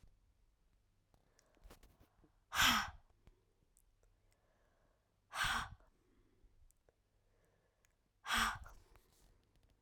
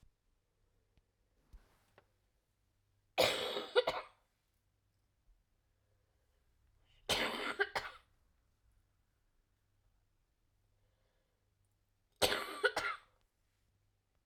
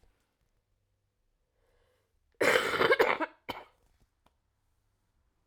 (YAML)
exhalation_length: 9.8 s
exhalation_amplitude: 3926
exhalation_signal_mean_std_ratio: 0.27
three_cough_length: 14.3 s
three_cough_amplitude: 5786
three_cough_signal_mean_std_ratio: 0.27
cough_length: 5.5 s
cough_amplitude: 10469
cough_signal_mean_std_ratio: 0.29
survey_phase: alpha (2021-03-01 to 2021-08-12)
age: 18-44
gender: Female
wearing_mask: 'No'
symptom_cough_any: true
symptom_fatigue: true
symptom_onset: 6 days
smoker_status: Never smoked
respiratory_condition_asthma: false
respiratory_condition_other: false
recruitment_source: Test and Trace
submission_delay: 2 days
covid_test_result: Positive
covid_test_method: RT-qPCR